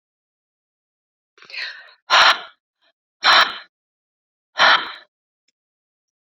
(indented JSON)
{
  "exhalation_length": "6.2 s",
  "exhalation_amplitude": 29624,
  "exhalation_signal_mean_std_ratio": 0.3,
  "survey_phase": "beta (2021-08-13 to 2022-03-07)",
  "age": "45-64",
  "gender": "Female",
  "wearing_mask": "No",
  "symptom_runny_or_blocked_nose": true,
  "symptom_other": true,
  "smoker_status": "Never smoked",
  "respiratory_condition_asthma": false,
  "respiratory_condition_other": false,
  "recruitment_source": "Test and Trace",
  "submission_delay": "2 days",
  "covid_test_result": "Positive",
  "covid_test_method": "ePCR"
}